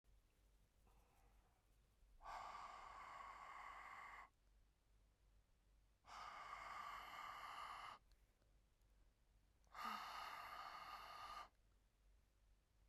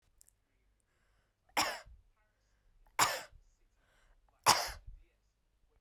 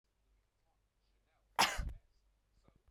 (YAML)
exhalation_length: 12.9 s
exhalation_amplitude: 358
exhalation_signal_mean_std_ratio: 0.69
three_cough_length: 5.8 s
three_cough_amplitude: 11958
three_cough_signal_mean_std_ratio: 0.25
cough_length: 2.9 s
cough_amplitude: 4408
cough_signal_mean_std_ratio: 0.24
survey_phase: beta (2021-08-13 to 2022-03-07)
age: 18-44
gender: Female
wearing_mask: 'No'
symptom_none: true
smoker_status: Ex-smoker
respiratory_condition_asthma: false
respiratory_condition_other: false
recruitment_source: REACT
submission_delay: 1 day
covid_test_result: Negative
covid_test_method: RT-qPCR